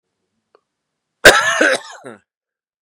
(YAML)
cough_length: 2.8 s
cough_amplitude: 32768
cough_signal_mean_std_ratio: 0.32
survey_phase: beta (2021-08-13 to 2022-03-07)
age: 45-64
gender: Male
wearing_mask: 'No'
symptom_cough_any: true
symptom_new_continuous_cough: true
symptom_runny_or_blocked_nose: true
symptom_fatigue: true
symptom_fever_high_temperature: true
symptom_headache: true
symptom_other: true
smoker_status: Never smoked
respiratory_condition_asthma: false
respiratory_condition_other: false
recruitment_source: Test and Trace
submission_delay: 2 days
covid_test_result: Positive
covid_test_method: LFT